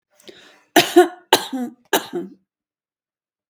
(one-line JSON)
{"three_cough_length": "3.5 s", "three_cough_amplitude": 32768, "three_cough_signal_mean_std_ratio": 0.3, "survey_phase": "beta (2021-08-13 to 2022-03-07)", "age": "65+", "gender": "Female", "wearing_mask": "No", "symptom_none": true, "smoker_status": "Never smoked", "respiratory_condition_asthma": false, "respiratory_condition_other": false, "recruitment_source": "REACT", "submission_delay": "1 day", "covid_test_result": "Negative", "covid_test_method": "RT-qPCR"}